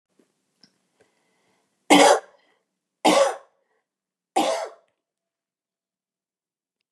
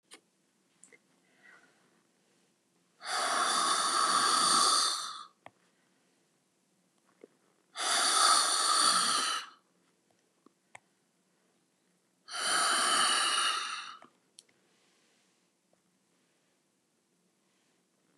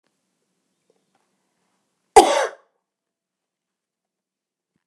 {"three_cough_length": "6.9 s", "three_cough_amplitude": 29721, "three_cough_signal_mean_std_ratio": 0.27, "exhalation_length": "18.2 s", "exhalation_amplitude": 7542, "exhalation_signal_mean_std_ratio": 0.46, "cough_length": "4.9 s", "cough_amplitude": 32768, "cough_signal_mean_std_ratio": 0.16, "survey_phase": "beta (2021-08-13 to 2022-03-07)", "age": "65+", "gender": "Female", "wearing_mask": "No", "symptom_none": true, "smoker_status": "Ex-smoker", "respiratory_condition_asthma": false, "respiratory_condition_other": false, "recruitment_source": "REACT", "submission_delay": "1 day", "covid_test_result": "Negative", "covid_test_method": "RT-qPCR", "influenza_a_test_result": "Negative", "influenza_b_test_result": "Negative"}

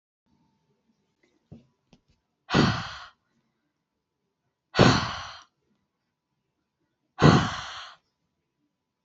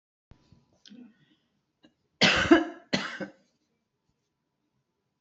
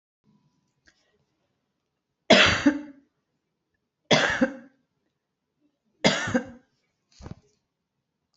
{"exhalation_length": "9.0 s", "exhalation_amplitude": 24840, "exhalation_signal_mean_std_ratio": 0.26, "cough_length": "5.2 s", "cough_amplitude": 20488, "cough_signal_mean_std_ratio": 0.25, "three_cough_length": "8.4 s", "three_cough_amplitude": 27503, "three_cough_signal_mean_std_ratio": 0.28, "survey_phase": "alpha (2021-03-01 to 2021-08-12)", "age": "65+", "gender": "Female", "wearing_mask": "No", "symptom_none": true, "smoker_status": "Ex-smoker", "respiratory_condition_asthma": false, "respiratory_condition_other": false, "recruitment_source": "REACT", "submission_delay": "1 day", "covid_test_result": "Negative", "covid_test_method": "RT-qPCR"}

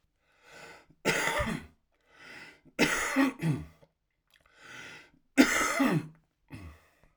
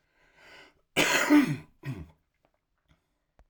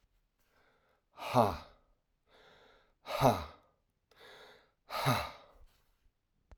{"three_cough_length": "7.2 s", "three_cough_amplitude": 15582, "three_cough_signal_mean_std_ratio": 0.43, "cough_length": "3.5 s", "cough_amplitude": 12325, "cough_signal_mean_std_ratio": 0.34, "exhalation_length": "6.6 s", "exhalation_amplitude": 7809, "exhalation_signal_mean_std_ratio": 0.3, "survey_phase": "alpha (2021-03-01 to 2021-08-12)", "age": "45-64", "gender": "Male", "wearing_mask": "No", "symptom_none": true, "smoker_status": "Never smoked", "respiratory_condition_asthma": true, "respiratory_condition_other": false, "recruitment_source": "REACT", "submission_delay": "2 days", "covid_test_result": "Negative", "covid_test_method": "RT-qPCR"}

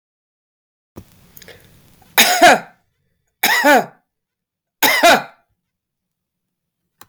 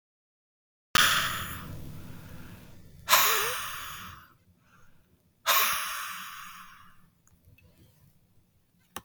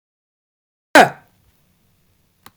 {"three_cough_length": "7.1 s", "three_cough_amplitude": 32768, "three_cough_signal_mean_std_ratio": 0.34, "exhalation_length": "9.0 s", "exhalation_amplitude": 16905, "exhalation_signal_mean_std_ratio": 0.41, "cough_length": "2.6 s", "cough_amplitude": 32766, "cough_signal_mean_std_ratio": 0.19, "survey_phase": "beta (2021-08-13 to 2022-03-07)", "age": "65+", "gender": "Female", "wearing_mask": "No", "symptom_runny_or_blocked_nose": true, "smoker_status": "Never smoked", "respiratory_condition_asthma": false, "respiratory_condition_other": false, "recruitment_source": "REACT", "submission_delay": "2 days", "covid_test_result": "Negative", "covid_test_method": "RT-qPCR", "influenza_a_test_result": "Negative", "influenza_b_test_result": "Negative"}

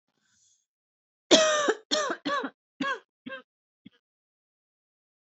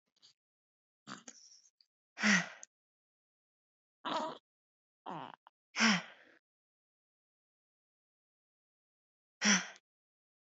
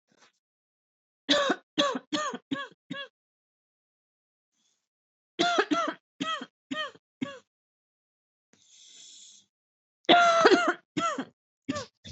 {"cough_length": "5.2 s", "cough_amplitude": 22539, "cough_signal_mean_std_ratio": 0.34, "exhalation_length": "10.4 s", "exhalation_amplitude": 6157, "exhalation_signal_mean_std_ratio": 0.25, "three_cough_length": "12.1 s", "three_cough_amplitude": 19025, "three_cough_signal_mean_std_ratio": 0.35, "survey_phase": "beta (2021-08-13 to 2022-03-07)", "age": "18-44", "gender": "Female", "wearing_mask": "No", "symptom_none": true, "smoker_status": "Ex-smoker", "respiratory_condition_asthma": false, "respiratory_condition_other": false, "recruitment_source": "REACT", "submission_delay": "1 day", "covid_test_result": "Negative", "covid_test_method": "RT-qPCR", "influenza_a_test_result": "Unknown/Void", "influenza_b_test_result": "Unknown/Void"}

